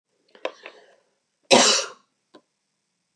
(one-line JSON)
{"cough_length": "3.2 s", "cough_amplitude": 31198, "cough_signal_mean_std_ratio": 0.27, "survey_phase": "beta (2021-08-13 to 2022-03-07)", "age": "45-64", "gender": "Female", "wearing_mask": "No", "symptom_cough_any": true, "symptom_sore_throat": true, "symptom_fatigue": true, "symptom_headache": true, "smoker_status": "Never smoked", "respiratory_condition_asthma": false, "respiratory_condition_other": false, "recruitment_source": "Test and Trace", "submission_delay": "2 days", "covid_test_result": "Negative", "covid_test_method": "RT-qPCR"}